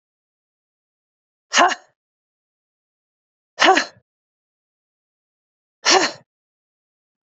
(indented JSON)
{
  "exhalation_length": "7.3 s",
  "exhalation_amplitude": 31984,
  "exhalation_signal_mean_std_ratio": 0.23,
  "survey_phase": "beta (2021-08-13 to 2022-03-07)",
  "age": "18-44",
  "gender": "Female",
  "wearing_mask": "No",
  "symptom_none": true,
  "smoker_status": "Never smoked",
  "respiratory_condition_asthma": false,
  "respiratory_condition_other": false,
  "recruitment_source": "REACT",
  "submission_delay": "1 day",
  "covid_test_result": "Negative",
  "covid_test_method": "RT-qPCR",
  "influenza_a_test_result": "Negative",
  "influenza_b_test_result": "Negative"
}